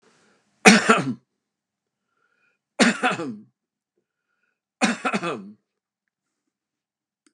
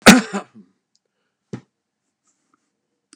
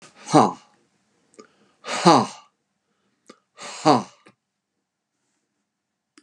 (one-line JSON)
{"three_cough_length": "7.3 s", "three_cough_amplitude": 32768, "three_cough_signal_mean_std_ratio": 0.28, "cough_length": "3.2 s", "cough_amplitude": 32768, "cough_signal_mean_std_ratio": 0.19, "exhalation_length": "6.2 s", "exhalation_amplitude": 30802, "exhalation_signal_mean_std_ratio": 0.25, "survey_phase": "beta (2021-08-13 to 2022-03-07)", "age": "65+", "gender": "Male", "wearing_mask": "No", "symptom_none": true, "smoker_status": "Never smoked", "respiratory_condition_asthma": false, "respiratory_condition_other": false, "recruitment_source": "REACT", "submission_delay": "2 days", "covid_test_result": "Negative", "covid_test_method": "RT-qPCR", "influenza_a_test_result": "Negative", "influenza_b_test_result": "Negative"}